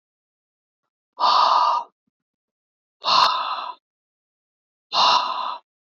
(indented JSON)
{
  "exhalation_length": "6.0 s",
  "exhalation_amplitude": 23752,
  "exhalation_signal_mean_std_ratio": 0.44,
  "survey_phase": "beta (2021-08-13 to 2022-03-07)",
  "age": "18-44",
  "gender": "Male",
  "wearing_mask": "No",
  "symptom_cough_any": true,
  "symptom_runny_or_blocked_nose": true,
  "symptom_fatigue": true,
  "symptom_headache": true,
  "smoker_status": "Never smoked",
  "respiratory_condition_asthma": false,
  "respiratory_condition_other": false,
  "recruitment_source": "Test and Trace",
  "submission_delay": "2 days",
  "covid_test_result": "Positive",
  "covid_test_method": "RT-qPCR",
  "covid_ct_value": 14.8,
  "covid_ct_gene": "ORF1ab gene"
}